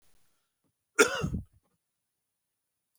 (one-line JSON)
{"cough_length": "3.0 s", "cough_amplitude": 14732, "cough_signal_mean_std_ratio": 0.23, "survey_phase": "beta (2021-08-13 to 2022-03-07)", "age": "45-64", "gender": "Male", "wearing_mask": "No", "symptom_none": true, "smoker_status": "Ex-smoker", "respiratory_condition_asthma": false, "respiratory_condition_other": false, "recruitment_source": "REACT", "submission_delay": "8 days", "covid_test_result": "Negative", "covid_test_method": "RT-qPCR", "influenza_a_test_result": "Negative", "influenza_b_test_result": "Negative"}